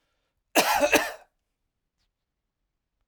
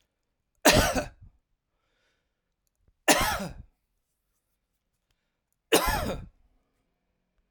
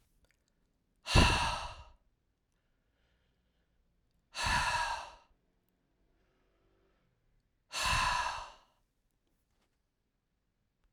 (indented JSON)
{
  "cough_length": "3.1 s",
  "cough_amplitude": 18431,
  "cough_signal_mean_std_ratio": 0.31,
  "three_cough_length": "7.5 s",
  "three_cough_amplitude": 25512,
  "three_cough_signal_mean_std_ratio": 0.29,
  "exhalation_length": "10.9 s",
  "exhalation_amplitude": 8447,
  "exhalation_signal_mean_std_ratio": 0.32,
  "survey_phase": "alpha (2021-03-01 to 2021-08-12)",
  "age": "45-64",
  "gender": "Male",
  "wearing_mask": "No",
  "symptom_none": true,
  "smoker_status": "Ex-smoker",
  "respiratory_condition_asthma": false,
  "respiratory_condition_other": false,
  "recruitment_source": "REACT",
  "submission_delay": "1 day",
  "covid_test_result": "Negative",
  "covid_test_method": "RT-qPCR"
}